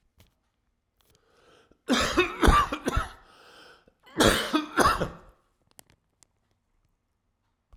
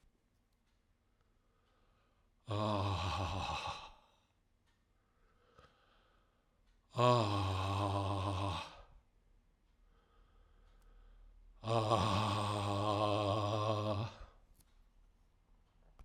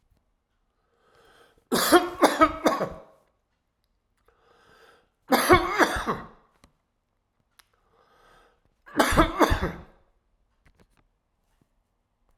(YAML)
cough_length: 7.8 s
cough_amplitude: 20767
cough_signal_mean_std_ratio: 0.36
exhalation_length: 16.0 s
exhalation_amplitude: 5608
exhalation_signal_mean_std_ratio: 0.52
three_cough_length: 12.4 s
three_cough_amplitude: 26334
three_cough_signal_mean_std_ratio: 0.32
survey_phase: alpha (2021-03-01 to 2021-08-12)
age: 65+
gender: Male
wearing_mask: 'No'
symptom_cough_any: true
symptom_shortness_of_breath: true
symptom_fatigue: true
symptom_headache: true
symptom_change_to_sense_of_smell_or_taste: true
symptom_loss_of_taste: true
smoker_status: Never smoked
respiratory_condition_asthma: false
respiratory_condition_other: false
recruitment_source: Test and Trace
submission_delay: 2 days
covid_test_result: Positive
covid_test_method: RT-qPCR
covid_ct_value: 28.7
covid_ct_gene: ORF1ab gene